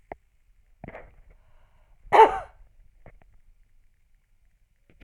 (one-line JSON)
{"cough_length": "5.0 s", "cough_amplitude": 24138, "cough_signal_mean_std_ratio": 0.19, "survey_phase": "alpha (2021-03-01 to 2021-08-12)", "age": "65+", "gender": "Female", "wearing_mask": "No", "symptom_none": true, "smoker_status": "Never smoked", "respiratory_condition_asthma": false, "respiratory_condition_other": false, "recruitment_source": "REACT", "submission_delay": "1 day", "covid_test_result": "Negative", "covid_test_method": "RT-qPCR"}